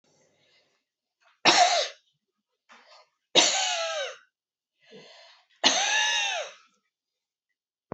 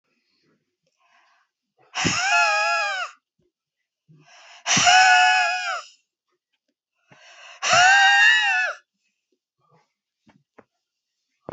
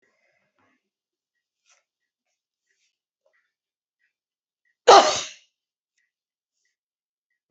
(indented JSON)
{
  "three_cough_length": "7.9 s",
  "three_cough_amplitude": 23154,
  "three_cough_signal_mean_std_ratio": 0.39,
  "exhalation_length": "11.5 s",
  "exhalation_amplitude": 26058,
  "exhalation_signal_mean_std_ratio": 0.44,
  "cough_length": "7.5 s",
  "cough_amplitude": 30538,
  "cough_signal_mean_std_ratio": 0.14,
  "survey_phase": "beta (2021-08-13 to 2022-03-07)",
  "age": "65+",
  "gender": "Female",
  "wearing_mask": "No",
  "symptom_cough_any": true,
  "symptom_runny_or_blocked_nose": true,
  "symptom_fatigue": true,
  "smoker_status": "Never smoked",
  "respiratory_condition_asthma": false,
  "respiratory_condition_other": false,
  "recruitment_source": "Test and Trace",
  "submission_delay": "2 days",
  "covid_test_result": "Positive",
  "covid_test_method": "RT-qPCR",
  "covid_ct_value": 24.0,
  "covid_ct_gene": "ORF1ab gene",
  "covid_ct_mean": 25.1,
  "covid_viral_load": "5700 copies/ml",
  "covid_viral_load_category": "Minimal viral load (< 10K copies/ml)"
}